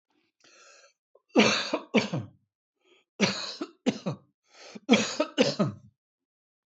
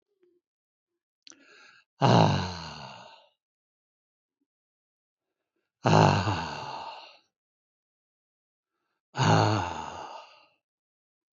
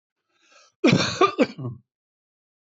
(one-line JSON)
{"three_cough_length": "6.7 s", "three_cough_amplitude": 16141, "three_cough_signal_mean_std_ratio": 0.38, "exhalation_length": "11.3 s", "exhalation_amplitude": 18352, "exhalation_signal_mean_std_ratio": 0.33, "cough_length": "2.6 s", "cough_amplitude": 18436, "cough_signal_mean_std_ratio": 0.36, "survey_phase": "beta (2021-08-13 to 2022-03-07)", "age": "65+", "gender": "Male", "wearing_mask": "No", "symptom_none": true, "smoker_status": "Never smoked", "respiratory_condition_asthma": true, "respiratory_condition_other": false, "recruitment_source": "REACT", "submission_delay": "1 day", "covid_test_result": "Negative", "covid_test_method": "RT-qPCR", "influenza_a_test_result": "Unknown/Void", "influenza_b_test_result": "Unknown/Void"}